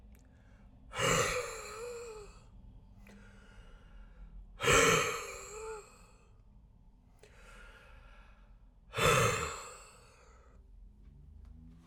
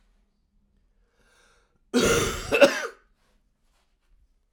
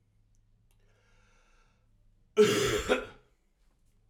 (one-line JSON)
{"exhalation_length": "11.9 s", "exhalation_amplitude": 6555, "exhalation_signal_mean_std_ratio": 0.41, "cough_length": "4.5 s", "cough_amplitude": 26789, "cough_signal_mean_std_ratio": 0.31, "three_cough_length": "4.1 s", "three_cough_amplitude": 8980, "three_cough_signal_mean_std_ratio": 0.31, "survey_phase": "alpha (2021-03-01 to 2021-08-12)", "age": "45-64", "gender": "Male", "wearing_mask": "No", "symptom_cough_any": true, "symptom_shortness_of_breath": true, "symptom_fatigue": true, "symptom_fever_high_temperature": true, "symptom_headache": true, "symptom_change_to_sense_of_smell_or_taste": true, "symptom_loss_of_taste": true, "symptom_onset": "2 days", "smoker_status": "Ex-smoker", "respiratory_condition_asthma": false, "respiratory_condition_other": false, "recruitment_source": "Test and Trace", "submission_delay": "2 days", "covid_test_result": "Positive", "covid_test_method": "ePCR"}